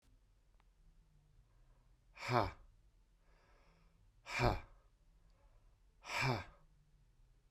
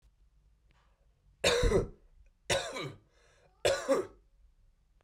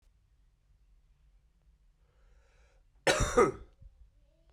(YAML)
exhalation_length: 7.5 s
exhalation_amplitude: 4099
exhalation_signal_mean_std_ratio: 0.31
three_cough_length: 5.0 s
three_cough_amplitude: 7742
three_cough_signal_mean_std_ratio: 0.39
cough_length: 4.5 s
cough_amplitude: 9054
cough_signal_mean_std_ratio: 0.26
survey_phase: beta (2021-08-13 to 2022-03-07)
age: 18-44
gender: Male
wearing_mask: 'No'
symptom_runny_or_blocked_nose: true
symptom_sore_throat: true
smoker_status: Current smoker (1 to 10 cigarettes per day)
respiratory_condition_asthma: false
respiratory_condition_other: false
recruitment_source: REACT
submission_delay: 2 days
covid_test_result: Negative
covid_test_method: RT-qPCR
influenza_a_test_result: Negative
influenza_b_test_result: Negative